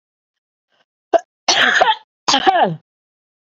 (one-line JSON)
{"cough_length": "3.5 s", "cough_amplitude": 32593, "cough_signal_mean_std_ratio": 0.42, "survey_phase": "beta (2021-08-13 to 2022-03-07)", "age": "45-64", "gender": "Female", "wearing_mask": "No", "symptom_runny_or_blocked_nose": true, "symptom_sore_throat": true, "symptom_onset": "2 days", "smoker_status": "Never smoked", "respiratory_condition_asthma": false, "respiratory_condition_other": false, "recruitment_source": "Test and Trace", "submission_delay": "1 day", "covid_test_result": "Positive", "covid_test_method": "RT-qPCR", "covid_ct_value": 26.8, "covid_ct_gene": "ORF1ab gene", "covid_ct_mean": 27.2, "covid_viral_load": "1200 copies/ml", "covid_viral_load_category": "Minimal viral load (< 10K copies/ml)"}